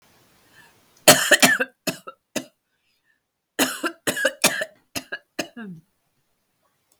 {"cough_length": "7.0 s", "cough_amplitude": 32768, "cough_signal_mean_std_ratio": 0.3, "survey_phase": "beta (2021-08-13 to 2022-03-07)", "age": "45-64", "gender": "Female", "wearing_mask": "No", "symptom_cough_any": true, "symptom_new_continuous_cough": true, "symptom_runny_or_blocked_nose": true, "symptom_shortness_of_breath": true, "symptom_fatigue": true, "symptom_fever_high_temperature": true, "symptom_change_to_sense_of_smell_or_taste": true, "symptom_loss_of_taste": true, "symptom_onset": "8 days", "smoker_status": "Ex-smoker", "respiratory_condition_asthma": false, "respiratory_condition_other": false, "recruitment_source": "Test and Trace", "submission_delay": "2 days", "covid_test_result": "Positive", "covid_test_method": "RT-qPCR", "covid_ct_value": 24.3, "covid_ct_gene": "ORF1ab gene"}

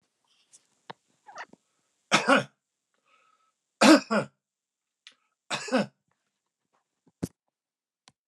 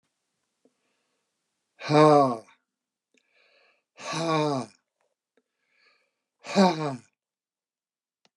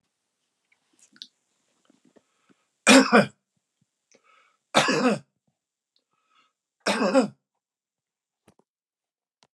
{"cough_length": "8.3 s", "cough_amplitude": 25629, "cough_signal_mean_std_ratio": 0.23, "exhalation_length": "8.4 s", "exhalation_amplitude": 17105, "exhalation_signal_mean_std_ratio": 0.29, "three_cough_length": "9.6 s", "three_cough_amplitude": 30068, "three_cough_signal_mean_std_ratio": 0.25, "survey_phase": "alpha (2021-03-01 to 2021-08-12)", "age": "65+", "gender": "Male", "wearing_mask": "No", "symptom_none": true, "smoker_status": "Never smoked", "respiratory_condition_asthma": false, "respiratory_condition_other": false, "recruitment_source": "REACT", "submission_delay": "1 day", "covid_test_result": "Negative", "covid_test_method": "RT-qPCR"}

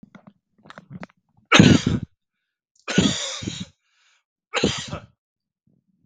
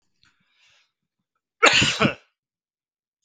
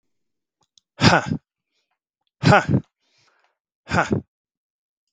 {"three_cough_length": "6.1 s", "three_cough_amplitude": 32768, "three_cough_signal_mean_std_ratio": 0.31, "cough_length": "3.2 s", "cough_amplitude": 32768, "cough_signal_mean_std_ratio": 0.28, "exhalation_length": "5.1 s", "exhalation_amplitude": 32768, "exhalation_signal_mean_std_ratio": 0.29, "survey_phase": "beta (2021-08-13 to 2022-03-07)", "age": "18-44", "gender": "Male", "wearing_mask": "No", "symptom_none": true, "symptom_onset": "12 days", "smoker_status": "Never smoked", "respiratory_condition_asthma": false, "respiratory_condition_other": false, "recruitment_source": "REACT", "submission_delay": "6 days", "covid_test_result": "Positive", "covid_test_method": "RT-qPCR", "covid_ct_value": 36.0, "covid_ct_gene": "N gene"}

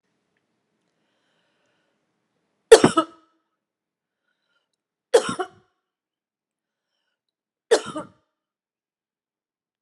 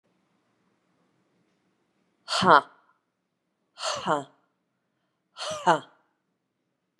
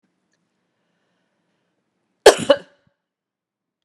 {"three_cough_length": "9.8 s", "three_cough_amplitude": 32768, "three_cough_signal_mean_std_ratio": 0.15, "exhalation_length": "7.0 s", "exhalation_amplitude": 24356, "exhalation_signal_mean_std_ratio": 0.23, "cough_length": "3.8 s", "cough_amplitude": 32768, "cough_signal_mean_std_ratio": 0.15, "survey_phase": "beta (2021-08-13 to 2022-03-07)", "age": "45-64", "gender": "Female", "wearing_mask": "No", "symptom_none": true, "smoker_status": "Ex-smoker", "respiratory_condition_asthma": false, "respiratory_condition_other": false, "recruitment_source": "REACT", "submission_delay": "0 days", "covid_test_result": "Negative", "covid_test_method": "RT-qPCR"}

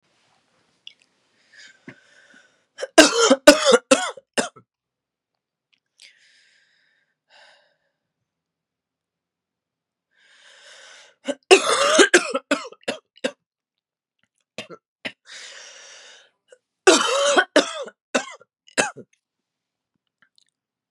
{"three_cough_length": "20.9 s", "three_cough_amplitude": 32768, "three_cough_signal_mean_std_ratio": 0.26, "survey_phase": "beta (2021-08-13 to 2022-03-07)", "age": "18-44", "gender": "Female", "wearing_mask": "No", "symptom_new_continuous_cough": true, "symptom_runny_or_blocked_nose": true, "symptom_shortness_of_breath": true, "symptom_sore_throat": true, "symptom_abdominal_pain": true, "symptom_fatigue": true, "symptom_fever_high_temperature": true, "symptom_headache": true, "symptom_change_to_sense_of_smell_or_taste": true, "smoker_status": "Ex-smoker", "respiratory_condition_asthma": true, "respiratory_condition_other": false, "recruitment_source": "Test and Trace", "submission_delay": "1 day", "covid_test_result": "Positive", "covid_test_method": "LFT"}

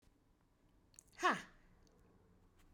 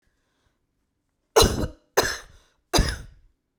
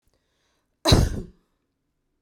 {"exhalation_length": "2.7 s", "exhalation_amplitude": 3040, "exhalation_signal_mean_std_ratio": 0.24, "three_cough_length": "3.6 s", "three_cough_amplitude": 26295, "three_cough_signal_mean_std_ratio": 0.32, "cough_length": "2.2 s", "cough_amplitude": 23377, "cough_signal_mean_std_ratio": 0.29, "survey_phase": "beta (2021-08-13 to 2022-03-07)", "age": "18-44", "gender": "Female", "wearing_mask": "No", "symptom_diarrhoea": true, "smoker_status": "Current smoker (1 to 10 cigarettes per day)", "respiratory_condition_asthma": false, "respiratory_condition_other": false, "recruitment_source": "REACT", "submission_delay": "0 days", "covid_test_result": "Negative", "covid_test_method": "RT-qPCR"}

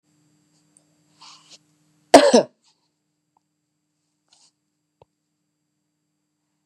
{"cough_length": "6.7 s", "cough_amplitude": 32768, "cough_signal_mean_std_ratio": 0.15, "survey_phase": "beta (2021-08-13 to 2022-03-07)", "age": "45-64", "gender": "Female", "wearing_mask": "No", "symptom_none": true, "symptom_onset": "3 days", "smoker_status": "Never smoked", "respiratory_condition_asthma": false, "respiratory_condition_other": false, "recruitment_source": "Test and Trace", "submission_delay": "2 days", "covid_test_result": "Positive", "covid_test_method": "RT-qPCR", "covid_ct_value": 20.3, "covid_ct_gene": "ORF1ab gene", "covid_ct_mean": 20.6, "covid_viral_load": "170000 copies/ml", "covid_viral_load_category": "Low viral load (10K-1M copies/ml)"}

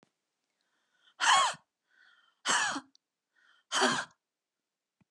{"exhalation_length": "5.1 s", "exhalation_amplitude": 8541, "exhalation_signal_mean_std_ratio": 0.34, "survey_phase": "alpha (2021-03-01 to 2021-08-12)", "age": "45-64", "gender": "Female", "wearing_mask": "No", "symptom_fatigue": true, "symptom_headache": true, "symptom_onset": "12 days", "smoker_status": "Never smoked", "respiratory_condition_asthma": false, "respiratory_condition_other": false, "recruitment_source": "REACT", "submission_delay": "3 days", "covid_test_result": "Negative", "covid_test_method": "RT-qPCR"}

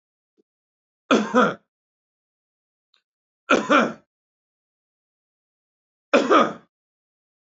{"three_cough_length": "7.4 s", "three_cough_amplitude": 22570, "three_cough_signal_mean_std_ratio": 0.29, "survey_phase": "beta (2021-08-13 to 2022-03-07)", "age": "45-64", "gender": "Male", "wearing_mask": "No", "symptom_none": true, "smoker_status": "Ex-smoker", "respiratory_condition_asthma": false, "respiratory_condition_other": false, "recruitment_source": "REACT", "submission_delay": "2 days", "covid_test_result": "Negative", "covid_test_method": "RT-qPCR", "influenza_a_test_result": "Unknown/Void", "influenza_b_test_result": "Unknown/Void"}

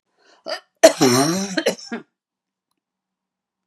{"cough_length": "3.7 s", "cough_amplitude": 32768, "cough_signal_mean_std_ratio": 0.34, "survey_phase": "beta (2021-08-13 to 2022-03-07)", "age": "65+", "gender": "Female", "wearing_mask": "No", "symptom_none": true, "smoker_status": "Never smoked", "respiratory_condition_asthma": true, "respiratory_condition_other": false, "recruitment_source": "REACT", "submission_delay": "3 days", "covid_test_result": "Negative", "covid_test_method": "RT-qPCR"}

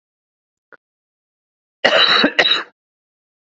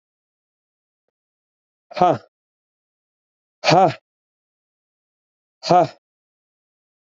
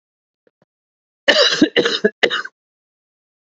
{"cough_length": "3.4 s", "cough_amplitude": 32424, "cough_signal_mean_std_ratio": 0.36, "exhalation_length": "7.1 s", "exhalation_amplitude": 27320, "exhalation_signal_mean_std_ratio": 0.23, "three_cough_length": "3.4 s", "three_cough_amplitude": 29435, "three_cough_signal_mean_std_ratio": 0.37, "survey_phase": "alpha (2021-03-01 to 2021-08-12)", "age": "18-44", "gender": "Male", "wearing_mask": "No", "symptom_cough_any": true, "symptom_new_continuous_cough": true, "symptom_shortness_of_breath": true, "symptom_fatigue": true, "symptom_headache": true, "symptom_onset": "4 days", "smoker_status": "Never smoked", "respiratory_condition_asthma": false, "respiratory_condition_other": false, "recruitment_source": "Test and Trace", "submission_delay": "2 days", "covid_test_result": "Positive", "covid_test_method": "RT-qPCR", "covid_ct_value": 26.0, "covid_ct_gene": "ORF1ab gene", "covid_ct_mean": 26.1, "covid_viral_load": "2800 copies/ml", "covid_viral_load_category": "Minimal viral load (< 10K copies/ml)"}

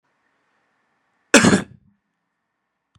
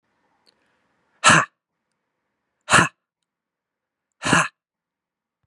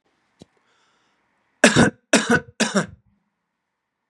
{"cough_length": "3.0 s", "cough_amplitude": 32768, "cough_signal_mean_std_ratio": 0.22, "exhalation_length": "5.5 s", "exhalation_amplitude": 31801, "exhalation_signal_mean_std_ratio": 0.25, "three_cough_length": "4.1 s", "three_cough_amplitude": 32744, "three_cough_signal_mean_std_ratio": 0.3, "survey_phase": "beta (2021-08-13 to 2022-03-07)", "age": "18-44", "gender": "Male", "wearing_mask": "No", "symptom_none": true, "symptom_onset": "6 days", "smoker_status": "Never smoked", "respiratory_condition_asthma": false, "respiratory_condition_other": false, "recruitment_source": "REACT", "submission_delay": "3 days", "covid_test_result": "Negative", "covid_test_method": "RT-qPCR", "influenza_a_test_result": "Negative", "influenza_b_test_result": "Negative"}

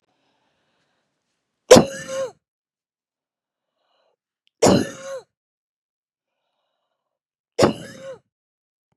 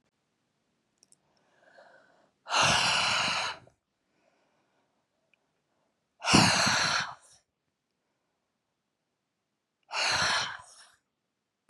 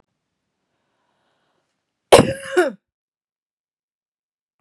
{"three_cough_length": "9.0 s", "three_cough_amplitude": 32768, "three_cough_signal_mean_std_ratio": 0.2, "exhalation_length": "11.7 s", "exhalation_amplitude": 18290, "exhalation_signal_mean_std_ratio": 0.37, "cough_length": "4.6 s", "cough_amplitude": 32768, "cough_signal_mean_std_ratio": 0.19, "survey_phase": "beta (2021-08-13 to 2022-03-07)", "age": "45-64", "gender": "Female", "wearing_mask": "No", "symptom_cough_any": true, "symptom_runny_or_blocked_nose": true, "symptom_sore_throat": true, "symptom_fatigue": true, "symptom_headache": true, "symptom_other": true, "symptom_onset": "2 days", "smoker_status": "Never smoked", "respiratory_condition_asthma": false, "respiratory_condition_other": false, "recruitment_source": "Test and Trace", "submission_delay": "1 day", "covid_test_result": "Positive", "covid_test_method": "RT-qPCR", "covid_ct_value": 18.1, "covid_ct_gene": "ORF1ab gene"}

